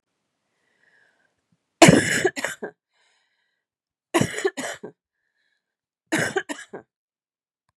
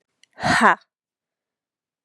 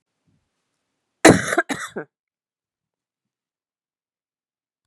{"three_cough_length": "7.8 s", "three_cough_amplitude": 32768, "three_cough_signal_mean_std_ratio": 0.26, "exhalation_length": "2.0 s", "exhalation_amplitude": 31461, "exhalation_signal_mean_std_ratio": 0.29, "cough_length": "4.9 s", "cough_amplitude": 32768, "cough_signal_mean_std_ratio": 0.19, "survey_phase": "beta (2021-08-13 to 2022-03-07)", "age": "45-64", "gender": "Female", "wearing_mask": "No", "symptom_cough_any": true, "symptom_runny_or_blocked_nose": true, "symptom_sore_throat": true, "symptom_abdominal_pain": true, "symptom_fatigue": true, "symptom_headache": true, "smoker_status": "Never smoked", "respiratory_condition_asthma": false, "respiratory_condition_other": false, "recruitment_source": "Test and Trace", "submission_delay": "1 day", "covid_test_result": "Positive", "covid_test_method": "LFT"}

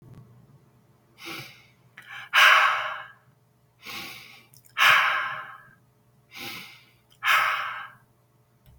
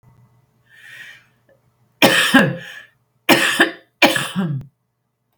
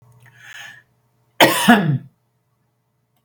{"exhalation_length": "8.8 s", "exhalation_amplitude": 23154, "exhalation_signal_mean_std_ratio": 0.38, "three_cough_length": "5.4 s", "three_cough_amplitude": 32768, "three_cough_signal_mean_std_ratio": 0.4, "cough_length": "3.2 s", "cough_amplitude": 32768, "cough_signal_mean_std_ratio": 0.32, "survey_phase": "beta (2021-08-13 to 2022-03-07)", "age": "45-64", "gender": "Female", "wearing_mask": "No", "symptom_none": true, "smoker_status": "Never smoked", "respiratory_condition_asthma": true, "respiratory_condition_other": false, "recruitment_source": "REACT", "submission_delay": "2 days", "covid_test_result": "Negative", "covid_test_method": "RT-qPCR", "influenza_a_test_result": "Negative", "influenza_b_test_result": "Negative"}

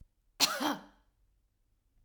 {"three_cough_length": "2.0 s", "three_cough_amplitude": 7633, "three_cough_signal_mean_std_ratio": 0.32, "survey_phase": "alpha (2021-03-01 to 2021-08-12)", "age": "45-64", "gender": "Female", "wearing_mask": "No", "symptom_none": true, "smoker_status": "Never smoked", "respiratory_condition_asthma": false, "respiratory_condition_other": false, "recruitment_source": "REACT", "submission_delay": "2 days", "covid_test_result": "Negative", "covid_test_method": "RT-qPCR"}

